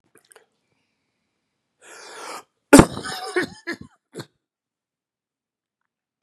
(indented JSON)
{
  "cough_length": "6.2 s",
  "cough_amplitude": 32768,
  "cough_signal_mean_std_ratio": 0.17,
  "survey_phase": "beta (2021-08-13 to 2022-03-07)",
  "age": "45-64",
  "gender": "Male",
  "wearing_mask": "No",
  "symptom_cough_any": true,
  "symptom_new_continuous_cough": true,
  "symptom_runny_or_blocked_nose": true,
  "symptom_fever_high_temperature": true,
  "symptom_headache": true,
  "symptom_onset": "4 days",
  "smoker_status": "Never smoked",
  "respiratory_condition_asthma": true,
  "respiratory_condition_other": false,
  "recruitment_source": "Test and Trace",
  "submission_delay": "2 days",
  "covid_test_result": "Positive",
  "covid_test_method": "RT-qPCR",
  "covid_ct_value": 24.1,
  "covid_ct_gene": "ORF1ab gene",
  "covid_ct_mean": 24.7,
  "covid_viral_load": "8000 copies/ml",
  "covid_viral_load_category": "Minimal viral load (< 10K copies/ml)"
}